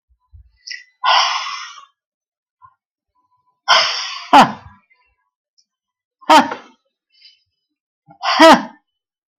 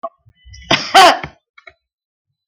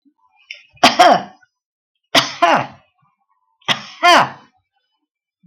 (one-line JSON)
{"exhalation_length": "9.4 s", "exhalation_amplitude": 32768, "exhalation_signal_mean_std_ratio": 0.32, "cough_length": "2.5 s", "cough_amplitude": 32768, "cough_signal_mean_std_ratio": 0.33, "three_cough_length": "5.5 s", "three_cough_amplitude": 32768, "three_cough_signal_mean_std_ratio": 0.35, "survey_phase": "beta (2021-08-13 to 2022-03-07)", "age": "65+", "gender": "Female", "wearing_mask": "No", "symptom_none": true, "smoker_status": "Never smoked", "respiratory_condition_asthma": false, "respiratory_condition_other": false, "recruitment_source": "REACT", "submission_delay": "3 days", "covid_test_result": "Negative", "covid_test_method": "RT-qPCR"}